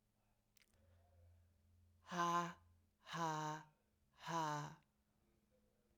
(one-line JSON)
{"exhalation_length": "6.0 s", "exhalation_amplitude": 1342, "exhalation_signal_mean_std_ratio": 0.41, "survey_phase": "beta (2021-08-13 to 2022-03-07)", "age": "18-44", "gender": "Female", "wearing_mask": "No", "symptom_cough_any": true, "symptom_new_continuous_cough": true, "symptom_runny_or_blocked_nose": true, "symptom_shortness_of_breath": true, "symptom_sore_throat": true, "symptom_fatigue": true, "symptom_headache": true, "symptom_onset": "3 days", "smoker_status": "Never smoked", "respiratory_condition_asthma": false, "respiratory_condition_other": false, "recruitment_source": "Test and Trace", "submission_delay": "1 day", "covid_test_result": "Positive", "covid_test_method": "RT-qPCR"}